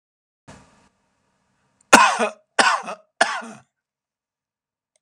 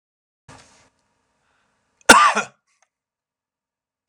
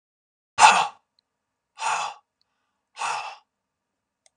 {"three_cough_length": "5.0 s", "three_cough_amplitude": 32768, "three_cough_signal_mean_std_ratio": 0.27, "cough_length": "4.1 s", "cough_amplitude": 32768, "cough_signal_mean_std_ratio": 0.2, "exhalation_length": "4.4 s", "exhalation_amplitude": 32723, "exhalation_signal_mean_std_ratio": 0.28, "survey_phase": "beta (2021-08-13 to 2022-03-07)", "age": "65+", "gender": "Male", "wearing_mask": "No", "symptom_none": true, "smoker_status": "Ex-smoker", "respiratory_condition_asthma": false, "respiratory_condition_other": false, "recruitment_source": "REACT", "submission_delay": "2 days", "covid_test_result": "Negative", "covid_test_method": "RT-qPCR"}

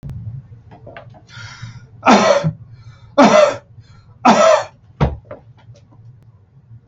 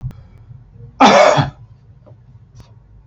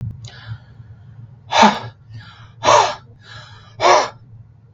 {"three_cough_length": "6.9 s", "three_cough_amplitude": 32686, "three_cough_signal_mean_std_ratio": 0.41, "cough_length": "3.1 s", "cough_amplitude": 32631, "cough_signal_mean_std_ratio": 0.37, "exhalation_length": "4.7 s", "exhalation_amplitude": 32731, "exhalation_signal_mean_std_ratio": 0.4, "survey_phase": "beta (2021-08-13 to 2022-03-07)", "age": "65+", "gender": "Male", "wearing_mask": "No", "symptom_none": true, "smoker_status": "Ex-smoker", "respiratory_condition_asthma": false, "respiratory_condition_other": false, "recruitment_source": "REACT", "submission_delay": "7 days", "covid_test_result": "Negative", "covid_test_method": "RT-qPCR", "influenza_a_test_result": "Negative", "influenza_b_test_result": "Negative"}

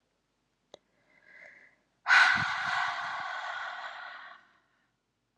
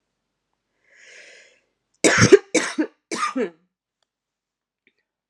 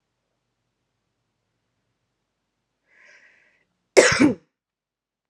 {"exhalation_length": "5.4 s", "exhalation_amplitude": 10796, "exhalation_signal_mean_std_ratio": 0.4, "three_cough_length": "5.3 s", "three_cough_amplitude": 32768, "three_cough_signal_mean_std_ratio": 0.26, "cough_length": "5.3 s", "cough_amplitude": 32690, "cough_signal_mean_std_ratio": 0.19, "survey_phase": "beta (2021-08-13 to 2022-03-07)", "age": "18-44", "gender": "Female", "wearing_mask": "No", "symptom_prefer_not_to_say": true, "smoker_status": "Current smoker (1 to 10 cigarettes per day)", "respiratory_condition_asthma": false, "respiratory_condition_other": false, "recruitment_source": "REACT", "submission_delay": "3 days", "covid_test_result": "Negative", "covid_test_method": "RT-qPCR", "influenza_a_test_result": "Negative", "influenza_b_test_result": "Negative"}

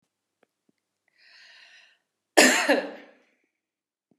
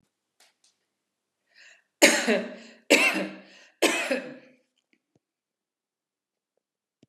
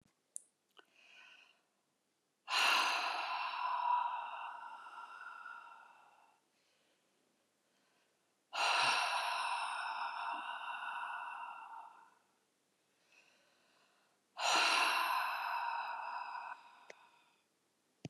{"cough_length": "4.2 s", "cough_amplitude": 25444, "cough_signal_mean_std_ratio": 0.25, "three_cough_length": "7.1 s", "three_cough_amplitude": 29596, "three_cough_signal_mean_std_ratio": 0.3, "exhalation_length": "18.1 s", "exhalation_amplitude": 3477, "exhalation_signal_mean_std_ratio": 0.54, "survey_phase": "beta (2021-08-13 to 2022-03-07)", "age": "45-64", "gender": "Female", "wearing_mask": "No", "symptom_none": true, "smoker_status": "Never smoked", "respiratory_condition_asthma": false, "respiratory_condition_other": false, "recruitment_source": "REACT", "submission_delay": "1 day", "covid_test_result": "Negative", "covid_test_method": "RT-qPCR"}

